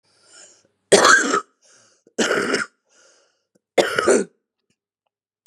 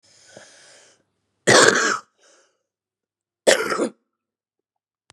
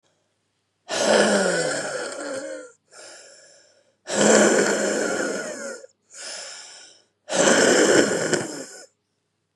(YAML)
three_cough_length: 5.5 s
three_cough_amplitude: 32768
three_cough_signal_mean_std_ratio: 0.37
cough_length: 5.1 s
cough_amplitude: 32767
cough_signal_mean_std_ratio: 0.3
exhalation_length: 9.6 s
exhalation_amplitude: 28786
exhalation_signal_mean_std_ratio: 0.56
survey_phase: beta (2021-08-13 to 2022-03-07)
age: 45-64
gender: Female
wearing_mask: 'No'
symptom_cough_any: true
symptom_shortness_of_breath: true
symptom_fatigue: true
symptom_headache: true
symptom_change_to_sense_of_smell_or_taste: true
symptom_loss_of_taste: true
symptom_other: true
symptom_onset: 5 days
smoker_status: Current smoker (11 or more cigarettes per day)
respiratory_condition_asthma: true
respiratory_condition_other: false
recruitment_source: Test and Trace
submission_delay: 2 days
covid_test_result: Positive
covid_test_method: ePCR